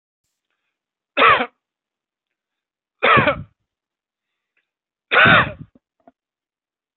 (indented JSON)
{
  "three_cough_length": "7.0 s",
  "three_cough_amplitude": 31529,
  "three_cough_signal_mean_std_ratio": 0.29,
  "survey_phase": "beta (2021-08-13 to 2022-03-07)",
  "age": "45-64",
  "gender": "Male",
  "wearing_mask": "No",
  "symptom_none": true,
  "smoker_status": "Ex-smoker",
  "respiratory_condition_asthma": false,
  "respiratory_condition_other": false,
  "recruitment_source": "REACT",
  "submission_delay": "1 day",
  "covid_test_result": "Negative",
  "covid_test_method": "RT-qPCR",
  "influenza_a_test_result": "Unknown/Void",
  "influenza_b_test_result": "Unknown/Void"
}